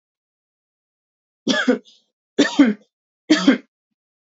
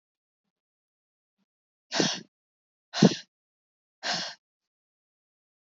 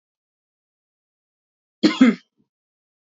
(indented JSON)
{
  "three_cough_length": "4.3 s",
  "three_cough_amplitude": 26101,
  "three_cough_signal_mean_std_ratio": 0.33,
  "exhalation_length": "5.6 s",
  "exhalation_amplitude": 17724,
  "exhalation_signal_mean_std_ratio": 0.21,
  "cough_length": "3.1 s",
  "cough_amplitude": 27171,
  "cough_signal_mean_std_ratio": 0.22,
  "survey_phase": "beta (2021-08-13 to 2022-03-07)",
  "age": "18-44",
  "gender": "Female",
  "wearing_mask": "No",
  "symptom_cough_any": true,
  "symptom_runny_or_blocked_nose": true,
  "symptom_sore_throat": true,
  "symptom_abdominal_pain": true,
  "symptom_fatigue": true,
  "symptom_other": true,
  "smoker_status": "Never smoked",
  "respiratory_condition_asthma": false,
  "respiratory_condition_other": false,
  "recruitment_source": "Test and Trace",
  "submission_delay": "2 days",
  "covid_test_result": "Positive",
  "covid_test_method": "LFT"
}